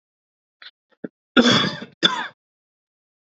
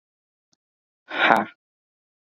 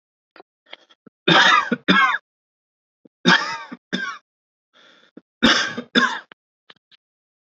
{"cough_length": "3.3 s", "cough_amplitude": 28825, "cough_signal_mean_std_ratio": 0.31, "exhalation_length": "2.3 s", "exhalation_amplitude": 32767, "exhalation_signal_mean_std_ratio": 0.26, "three_cough_length": "7.4 s", "three_cough_amplitude": 28246, "three_cough_signal_mean_std_ratio": 0.37, "survey_phase": "beta (2021-08-13 to 2022-03-07)", "age": "18-44", "gender": "Male", "wearing_mask": "No", "symptom_sore_throat": true, "symptom_fatigue": true, "symptom_onset": "6 days", "smoker_status": "Never smoked", "respiratory_condition_asthma": false, "respiratory_condition_other": false, "recruitment_source": "Test and Trace", "submission_delay": "3 days", "covid_test_result": "Positive", "covid_test_method": "RT-qPCR", "covid_ct_value": 27.7, "covid_ct_gene": "ORF1ab gene"}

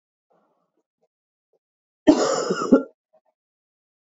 {"cough_length": "4.1 s", "cough_amplitude": 28496, "cough_signal_mean_std_ratio": 0.28, "survey_phase": "beta (2021-08-13 to 2022-03-07)", "age": "18-44", "gender": "Female", "wearing_mask": "No", "symptom_runny_or_blocked_nose": true, "symptom_fatigue": true, "symptom_other": true, "symptom_onset": "3 days", "smoker_status": "Never smoked", "respiratory_condition_asthma": false, "respiratory_condition_other": false, "recruitment_source": "Test and Trace", "submission_delay": "2 days", "covid_test_result": "Positive", "covid_test_method": "RT-qPCR", "covid_ct_value": 11.3, "covid_ct_gene": "ORF1ab gene"}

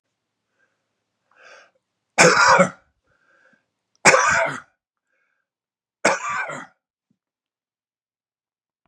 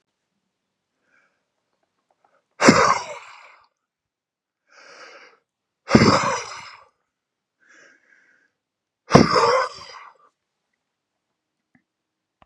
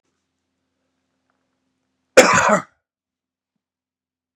{"three_cough_length": "8.9 s", "three_cough_amplitude": 32767, "three_cough_signal_mean_std_ratio": 0.3, "exhalation_length": "12.5 s", "exhalation_amplitude": 32768, "exhalation_signal_mean_std_ratio": 0.26, "cough_length": "4.4 s", "cough_amplitude": 32768, "cough_signal_mean_std_ratio": 0.23, "survey_phase": "beta (2021-08-13 to 2022-03-07)", "age": "65+", "gender": "Male", "wearing_mask": "No", "symptom_none": true, "smoker_status": "Ex-smoker", "respiratory_condition_asthma": false, "respiratory_condition_other": false, "recruitment_source": "Test and Trace", "submission_delay": "1 day", "covid_test_result": "Negative", "covid_test_method": "LAMP"}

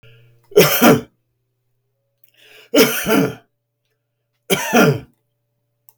{"three_cough_length": "6.0 s", "three_cough_amplitude": 32768, "three_cough_signal_mean_std_ratio": 0.38, "survey_phase": "beta (2021-08-13 to 2022-03-07)", "age": "65+", "gender": "Male", "wearing_mask": "No", "symptom_none": true, "smoker_status": "Ex-smoker", "respiratory_condition_asthma": false, "respiratory_condition_other": false, "recruitment_source": "REACT", "submission_delay": "4 days", "covid_test_result": "Negative", "covid_test_method": "RT-qPCR"}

